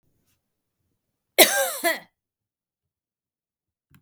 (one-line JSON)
{"cough_length": "4.0 s", "cough_amplitude": 32768, "cough_signal_mean_std_ratio": 0.23, "survey_phase": "beta (2021-08-13 to 2022-03-07)", "age": "18-44", "gender": "Female", "wearing_mask": "No", "symptom_none": true, "smoker_status": "Never smoked", "respiratory_condition_asthma": false, "respiratory_condition_other": false, "recruitment_source": "REACT", "submission_delay": "1 day", "covid_test_result": "Negative", "covid_test_method": "RT-qPCR", "influenza_a_test_result": "Negative", "influenza_b_test_result": "Negative"}